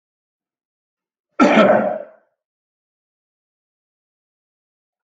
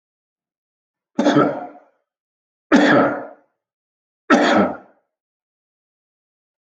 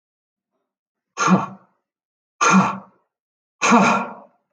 cough_length: 5.0 s
cough_amplitude: 27747
cough_signal_mean_std_ratio: 0.27
three_cough_length: 6.7 s
three_cough_amplitude: 27869
three_cough_signal_mean_std_ratio: 0.36
exhalation_length: 4.5 s
exhalation_amplitude: 27718
exhalation_signal_mean_std_ratio: 0.39
survey_phase: beta (2021-08-13 to 2022-03-07)
age: 45-64
gender: Male
wearing_mask: 'No'
symptom_none: true
smoker_status: Never smoked
respiratory_condition_asthma: false
respiratory_condition_other: false
recruitment_source: REACT
submission_delay: 1 day
covid_test_result: Negative
covid_test_method: RT-qPCR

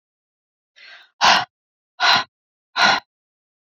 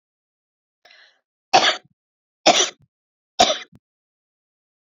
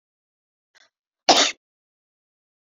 exhalation_length: 3.8 s
exhalation_amplitude: 28611
exhalation_signal_mean_std_ratio: 0.34
three_cough_length: 4.9 s
three_cough_amplitude: 30193
three_cough_signal_mean_std_ratio: 0.26
cough_length: 2.6 s
cough_amplitude: 27300
cough_signal_mean_std_ratio: 0.21
survey_phase: beta (2021-08-13 to 2022-03-07)
age: 45-64
gender: Female
wearing_mask: 'No'
symptom_none: true
smoker_status: Never smoked
respiratory_condition_asthma: false
respiratory_condition_other: false
recruitment_source: REACT
submission_delay: 1 day
covid_test_result: Negative
covid_test_method: RT-qPCR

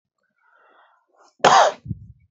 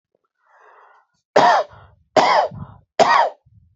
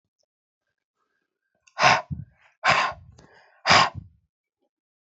cough_length: 2.3 s
cough_amplitude: 27211
cough_signal_mean_std_ratio: 0.3
three_cough_length: 3.8 s
three_cough_amplitude: 29030
three_cough_signal_mean_std_ratio: 0.42
exhalation_length: 5.0 s
exhalation_amplitude: 25769
exhalation_signal_mean_std_ratio: 0.31
survey_phase: beta (2021-08-13 to 2022-03-07)
age: 45-64
gender: Male
wearing_mask: 'No'
symptom_none: true
smoker_status: Never smoked
respiratory_condition_asthma: false
respiratory_condition_other: false
recruitment_source: REACT
submission_delay: 1 day
covid_test_result: Negative
covid_test_method: RT-qPCR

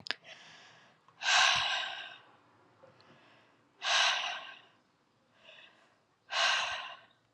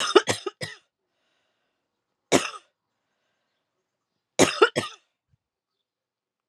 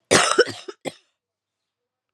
exhalation_length: 7.3 s
exhalation_amplitude: 10104
exhalation_signal_mean_std_ratio: 0.43
three_cough_length: 6.5 s
three_cough_amplitude: 31229
three_cough_signal_mean_std_ratio: 0.23
cough_length: 2.1 s
cough_amplitude: 28469
cough_signal_mean_std_ratio: 0.32
survey_phase: alpha (2021-03-01 to 2021-08-12)
age: 18-44
gender: Female
wearing_mask: 'No'
symptom_cough_any: true
symptom_fatigue: true
smoker_status: Current smoker (e-cigarettes or vapes only)
respiratory_condition_asthma: false
respiratory_condition_other: false
recruitment_source: Test and Trace
submission_delay: 2 days
covid_test_result: Positive
covid_test_method: RT-qPCR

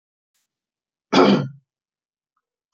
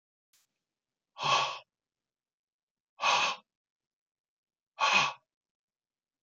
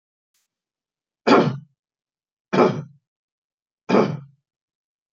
cough_length: 2.7 s
cough_amplitude: 27585
cough_signal_mean_std_ratio: 0.28
exhalation_length: 6.2 s
exhalation_amplitude: 8701
exhalation_signal_mean_std_ratio: 0.32
three_cough_length: 5.1 s
three_cough_amplitude: 26698
three_cough_signal_mean_std_ratio: 0.3
survey_phase: beta (2021-08-13 to 2022-03-07)
age: 45-64
gender: Male
wearing_mask: 'No'
symptom_none: true
smoker_status: Never smoked
respiratory_condition_asthma: false
respiratory_condition_other: false
recruitment_source: REACT
submission_delay: 1 day
covid_test_result: Negative
covid_test_method: RT-qPCR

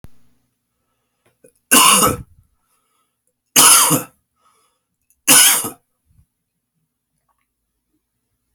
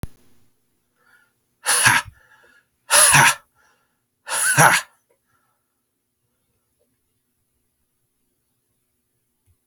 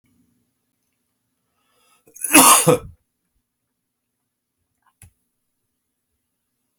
three_cough_length: 8.5 s
three_cough_amplitude: 32768
three_cough_signal_mean_std_ratio: 0.31
exhalation_length: 9.7 s
exhalation_amplitude: 32239
exhalation_signal_mean_std_ratio: 0.29
cough_length: 6.8 s
cough_amplitude: 32768
cough_signal_mean_std_ratio: 0.21
survey_phase: beta (2021-08-13 to 2022-03-07)
age: 45-64
gender: Male
wearing_mask: 'No'
symptom_cough_any: true
symptom_runny_or_blocked_nose: true
symptom_fever_high_temperature: true
symptom_headache: true
symptom_change_to_sense_of_smell_or_taste: true
symptom_onset: 3 days
smoker_status: Never smoked
respiratory_condition_asthma: false
respiratory_condition_other: false
recruitment_source: Test and Trace
submission_delay: 2 days
covid_test_result: Positive
covid_test_method: RT-qPCR
covid_ct_value: 17.6
covid_ct_gene: ORF1ab gene
covid_ct_mean: 18.0
covid_viral_load: 1200000 copies/ml
covid_viral_load_category: High viral load (>1M copies/ml)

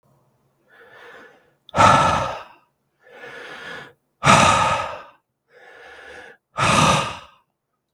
exhalation_length: 7.9 s
exhalation_amplitude: 32768
exhalation_signal_mean_std_ratio: 0.41
survey_phase: beta (2021-08-13 to 2022-03-07)
age: 45-64
gender: Male
wearing_mask: 'No'
symptom_cough_any: true
symptom_shortness_of_breath: true
symptom_fatigue: true
symptom_headache: true
symptom_change_to_sense_of_smell_or_taste: true
symptom_onset: 12 days
smoker_status: Ex-smoker
respiratory_condition_asthma: true
respiratory_condition_other: false
recruitment_source: REACT
submission_delay: 4 days
covid_test_result: Positive
covid_test_method: RT-qPCR
covid_ct_value: 24.0
covid_ct_gene: E gene
influenza_a_test_result: Negative
influenza_b_test_result: Negative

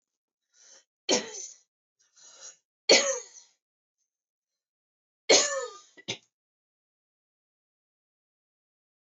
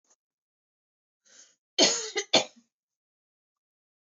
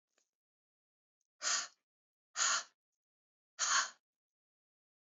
three_cough_length: 9.1 s
three_cough_amplitude: 15523
three_cough_signal_mean_std_ratio: 0.23
cough_length: 4.1 s
cough_amplitude: 14556
cough_signal_mean_std_ratio: 0.24
exhalation_length: 5.1 s
exhalation_amplitude: 3506
exhalation_signal_mean_std_ratio: 0.3
survey_phase: beta (2021-08-13 to 2022-03-07)
age: 45-64
gender: Female
wearing_mask: 'No'
symptom_none: true
smoker_status: Never smoked
respiratory_condition_asthma: false
respiratory_condition_other: false
recruitment_source: REACT
submission_delay: 1 day
covid_test_result: Negative
covid_test_method: RT-qPCR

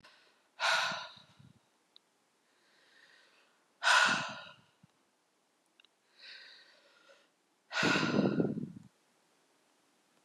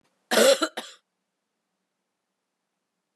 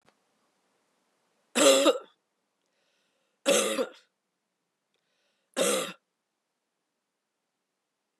exhalation_length: 10.2 s
exhalation_amplitude: 7055
exhalation_signal_mean_std_ratio: 0.35
cough_length: 3.2 s
cough_amplitude: 15848
cough_signal_mean_std_ratio: 0.26
three_cough_length: 8.2 s
three_cough_amplitude: 14074
three_cough_signal_mean_std_ratio: 0.28
survey_phase: beta (2021-08-13 to 2022-03-07)
age: 45-64
gender: Female
wearing_mask: 'No'
symptom_runny_or_blocked_nose: true
symptom_sore_throat: true
symptom_fatigue: true
symptom_headache: true
smoker_status: Current smoker (e-cigarettes or vapes only)
respiratory_condition_asthma: false
respiratory_condition_other: false
recruitment_source: Test and Trace
submission_delay: 1 day
covid_test_result: Positive
covid_test_method: RT-qPCR
covid_ct_value: 16.9
covid_ct_gene: ORF1ab gene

